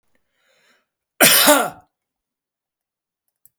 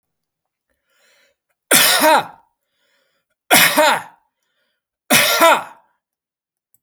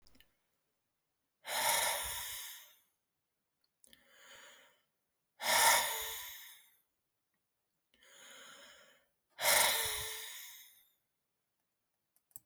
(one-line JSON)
{"cough_length": "3.6 s", "cough_amplitude": 32768, "cough_signal_mean_std_ratio": 0.29, "three_cough_length": "6.8 s", "three_cough_amplitude": 32768, "three_cough_signal_mean_std_ratio": 0.38, "exhalation_length": "12.5 s", "exhalation_amplitude": 6739, "exhalation_signal_mean_std_ratio": 0.36, "survey_phase": "alpha (2021-03-01 to 2021-08-12)", "age": "65+", "gender": "Male", "wearing_mask": "No", "symptom_cough_any": true, "symptom_onset": "6 days", "smoker_status": "Ex-smoker", "respiratory_condition_asthma": false, "respiratory_condition_other": false, "recruitment_source": "REACT", "submission_delay": "1 day", "covid_test_result": "Negative", "covid_test_method": "RT-qPCR"}